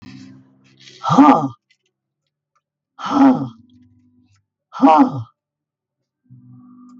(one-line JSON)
{"exhalation_length": "7.0 s", "exhalation_amplitude": 32768, "exhalation_signal_mean_std_ratio": 0.33, "survey_phase": "beta (2021-08-13 to 2022-03-07)", "age": "65+", "gender": "Female", "wearing_mask": "No", "symptom_none": true, "smoker_status": "Prefer not to say", "respiratory_condition_asthma": false, "respiratory_condition_other": false, "recruitment_source": "REACT", "submission_delay": "3 days", "covid_test_result": "Negative", "covid_test_method": "RT-qPCR", "influenza_a_test_result": "Negative", "influenza_b_test_result": "Negative"}